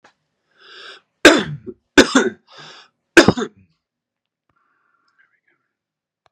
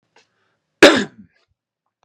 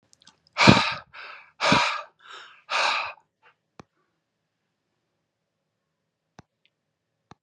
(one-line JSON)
{"three_cough_length": "6.3 s", "three_cough_amplitude": 32768, "three_cough_signal_mean_std_ratio": 0.24, "cough_length": "2.0 s", "cough_amplitude": 32768, "cough_signal_mean_std_ratio": 0.23, "exhalation_length": "7.4 s", "exhalation_amplitude": 32561, "exhalation_signal_mean_std_ratio": 0.28, "survey_phase": "beta (2021-08-13 to 2022-03-07)", "age": "45-64", "gender": "Male", "wearing_mask": "No", "symptom_none": true, "symptom_onset": "5 days", "smoker_status": "Ex-smoker", "respiratory_condition_asthma": false, "respiratory_condition_other": false, "recruitment_source": "REACT", "submission_delay": "1 day", "covid_test_result": "Negative", "covid_test_method": "RT-qPCR"}